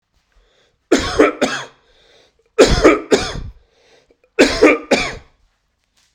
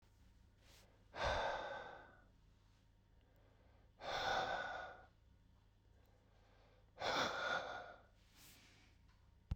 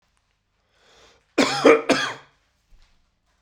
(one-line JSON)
{"three_cough_length": "6.1 s", "three_cough_amplitude": 32768, "three_cough_signal_mean_std_ratio": 0.4, "exhalation_length": "9.6 s", "exhalation_amplitude": 1430, "exhalation_signal_mean_std_ratio": 0.48, "cough_length": "3.4 s", "cough_amplitude": 32767, "cough_signal_mean_std_ratio": 0.31, "survey_phase": "beta (2021-08-13 to 2022-03-07)", "age": "65+", "gender": "Female", "wearing_mask": "Yes", "symptom_cough_any": true, "symptom_new_continuous_cough": true, "symptom_runny_or_blocked_nose": true, "symptom_shortness_of_breath": true, "symptom_sore_throat": true, "symptom_abdominal_pain": true, "symptom_diarrhoea": true, "symptom_fatigue": true, "symptom_fever_high_temperature": true, "symptom_headache": true, "symptom_change_to_sense_of_smell_or_taste": true, "symptom_loss_of_taste": true, "smoker_status": "Never smoked", "respiratory_condition_asthma": false, "respiratory_condition_other": false, "recruitment_source": "Test and Trace", "submission_delay": "2 days", "covid_test_result": "Negative", "covid_test_method": "LAMP"}